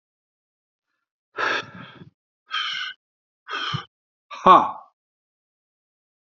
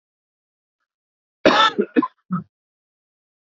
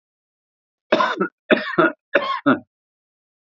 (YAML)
exhalation_length: 6.3 s
exhalation_amplitude: 28426
exhalation_signal_mean_std_ratio: 0.26
cough_length: 3.4 s
cough_amplitude: 26837
cough_signal_mean_std_ratio: 0.29
three_cough_length: 3.4 s
three_cough_amplitude: 32768
three_cough_signal_mean_std_ratio: 0.4
survey_phase: beta (2021-08-13 to 2022-03-07)
age: 45-64
gender: Male
wearing_mask: 'No'
symptom_cough_any: true
symptom_runny_or_blocked_nose: true
symptom_shortness_of_breath: true
symptom_sore_throat: true
symptom_diarrhoea: true
symptom_fatigue: true
symptom_fever_high_temperature: true
symptom_headache: true
symptom_change_to_sense_of_smell_or_taste: true
symptom_loss_of_taste: true
symptom_onset: 6 days
smoker_status: Ex-smoker
respiratory_condition_asthma: false
respiratory_condition_other: false
recruitment_source: Test and Trace
submission_delay: 1 day
covid_test_result: Positive
covid_test_method: RT-qPCR
covid_ct_value: 15.6
covid_ct_gene: ORF1ab gene
covid_ct_mean: 16.9
covid_viral_load: 3000000 copies/ml
covid_viral_load_category: High viral load (>1M copies/ml)